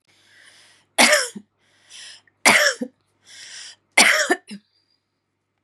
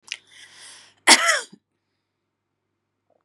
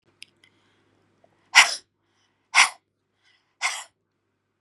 {"three_cough_length": "5.6 s", "three_cough_amplitude": 32757, "three_cough_signal_mean_std_ratio": 0.34, "cough_length": "3.2 s", "cough_amplitude": 32767, "cough_signal_mean_std_ratio": 0.24, "exhalation_length": "4.6 s", "exhalation_amplitude": 31933, "exhalation_signal_mean_std_ratio": 0.21, "survey_phase": "beta (2021-08-13 to 2022-03-07)", "age": "45-64", "gender": "Female", "wearing_mask": "No", "symptom_cough_any": true, "symptom_runny_or_blocked_nose": true, "symptom_fatigue": true, "symptom_onset": "6 days", "smoker_status": "Ex-smoker", "respiratory_condition_asthma": false, "respiratory_condition_other": false, "recruitment_source": "REACT", "submission_delay": "0 days", "covid_test_result": "Positive", "covid_test_method": "RT-qPCR", "covid_ct_value": 26.6, "covid_ct_gene": "E gene", "influenza_a_test_result": "Negative", "influenza_b_test_result": "Negative"}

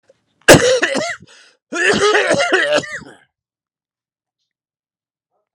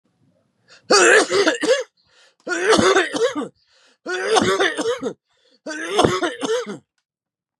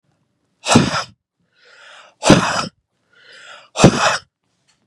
{"cough_length": "5.5 s", "cough_amplitude": 32768, "cough_signal_mean_std_ratio": 0.43, "three_cough_length": "7.6 s", "three_cough_amplitude": 32680, "three_cough_signal_mean_std_ratio": 0.56, "exhalation_length": "4.9 s", "exhalation_amplitude": 32768, "exhalation_signal_mean_std_ratio": 0.35, "survey_phase": "beta (2021-08-13 to 2022-03-07)", "age": "18-44", "gender": "Male", "wearing_mask": "No", "symptom_none": true, "smoker_status": "Current smoker (1 to 10 cigarettes per day)", "respiratory_condition_asthma": false, "respiratory_condition_other": false, "recruitment_source": "REACT", "submission_delay": "1 day", "covid_test_result": "Negative", "covid_test_method": "RT-qPCR", "influenza_a_test_result": "Negative", "influenza_b_test_result": "Negative"}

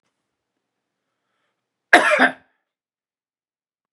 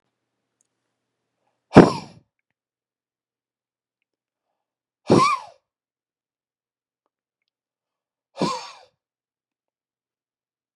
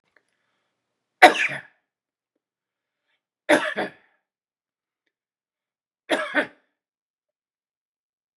{"cough_length": "3.9 s", "cough_amplitude": 32768, "cough_signal_mean_std_ratio": 0.22, "exhalation_length": "10.8 s", "exhalation_amplitude": 32768, "exhalation_signal_mean_std_ratio": 0.16, "three_cough_length": "8.4 s", "three_cough_amplitude": 32768, "three_cough_signal_mean_std_ratio": 0.2, "survey_phase": "beta (2021-08-13 to 2022-03-07)", "age": "45-64", "gender": "Male", "wearing_mask": "No", "symptom_none": true, "smoker_status": "Ex-smoker", "respiratory_condition_asthma": true, "respiratory_condition_other": false, "recruitment_source": "REACT", "submission_delay": "2 days", "covid_test_result": "Negative", "covid_test_method": "RT-qPCR", "influenza_a_test_result": "Negative", "influenza_b_test_result": "Negative"}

